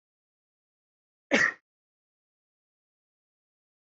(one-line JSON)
{"cough_length": "3.8 s", "cough_amplitude": 12639, "cough_signal_mean_std_ratio": 0.17, "survey_phase": "beta (2021-08-13 to 2022-03-07)", "age": "18-44", "gender": "Female", "wearing_mask": "No", "symptom_none": true, "smoker_status": "Never smoked", "respiratory_condition_asthma": false, "respiratory_condition_other": false, "recruitment_source": "REACT", "submission_delay": "1 day", "covid_test_result": "Negative", "covid_test_method": "RT-qPCR"}